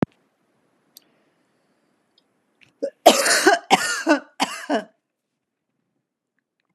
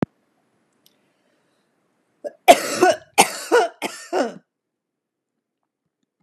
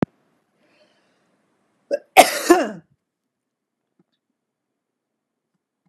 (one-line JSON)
{"exhalation_length": "6.7 s", "exhalation_amplitude": 32768, "exhalation_signal_mean_std_ratio": 0.3, "three_cough_length": "6.2 s", "three_cough_amplitude": 32768, "three_cough_signal_mean_std_ratio": 0.28, "cough_length": "5.9 s", "cough_amplitude": 32768, "cough_signal_mean_std_ratio": 0.19, "survey_phase": "beta (2021-08-13 to 2022-03-07)", "age": "45-64", "gender": "Female", "wearing_mask": "No", "symptom_none": true, "smoker_status": "Ex-smoker", "respiratory_condition_asthma": false, "respiratory_condition_other": false, "recruitment_source": "REACT", "submission_delay": "1 day", "covid_test_result": "Negative", "covid_test_method": "RT-qPCR", "influenza_a_test_result": "Negative", "influenza_b_test_result": "Negative"}